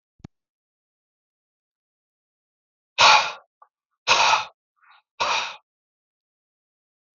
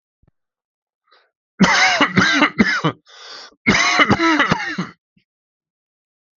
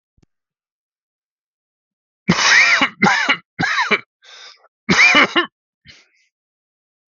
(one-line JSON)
{"exhalation_length": "7.2 s", "exhalation_amplitude": 28754, "exhalation_signal_mean_std_ratio": 0.27, "cough_length": "6.4 s", "cough_amplitude": 32768, "cough_signal_mean_std_ratio": 0.49, "three_cough_length": "7.1 s", "three_cough_amplitude": 32768, "three_cough_signal_mean_std_ratio": 0.41, "survey_phase": "alpha (2021-03-01 to 2021-08-12)", "age": "45-64", "gender": "Male", "wearing_mask": "No", "symptom_none": true, "smoker_status": "Never smoked", "respiratory_condition_asthma": false, "respiratory_condition_other": false, "recruitment_source": "REACT", "submission_delay": "1 day", "covid_test_result": "Negative", "covid_test_method": "RT-qPCR"}